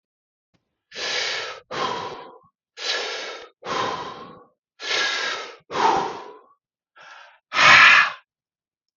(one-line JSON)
{"exhalation_length": "9.0 s", "exhalation_amplitude": 29989, "exhalation_signal_mean_std_ratio": 0.41, "survey_phase": "beta (2021-08-13 to 2022-03-07)", "age": "45-64", "gender": "Male", "wearing_mask": "No", "symptom_cough_any": true, "symptom_runny_or_blocked_nose": true, "symptom_sore_throat": true, "symptom_onset": "8 days", "smoker_status": "Ex-smoker", "respiratory_condition_asthma": false, "respiratory_condition_other": false, "recruitment_source": "REACT", "submission_delay": "1 day", "covid_test_result": "Negative", "covid_test_method": "RT-qPCR"}